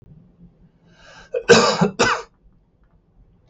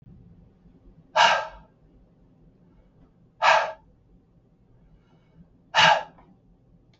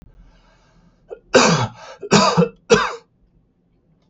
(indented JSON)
{
  "cough_length": "3.5 s",
  "cough_amplitude": 32768,
  "cough_signal_mean_std_ratio": 0.34,
  "exhalation_length": "7.0 s",
  "exhalation_amplitude": 20866,
  "exhalation_signal_mean_std_ratio": 0.29,
  "three_cough_length": "4.1 s",
  "three_cough_amplitude": 32768,
  "three_cough_signal_mean_std_ratio": 0.39,
  "survey_phase": "beta (2021-08-13 to 2022-03-07)",
  "age": "65+",
  "gender": "Male",
  "wearing_mask": "No",
  "symptom_none": true,
  "symptom_onset": "4 days",
  "smoker_status": "Ex-smoker",
  "respiratory_condition_asthma": false,
  "respiratory_condition_other": false,
  "recruitment_source": "REACT",
  "submission_delay": "2 days",
  "covid_test_result": "Negative",
  "covid_test_method": "RT-qPCR",
  "influenza_a_test_result": "Negative",
  "influenza_b_test_result": "Negative"
}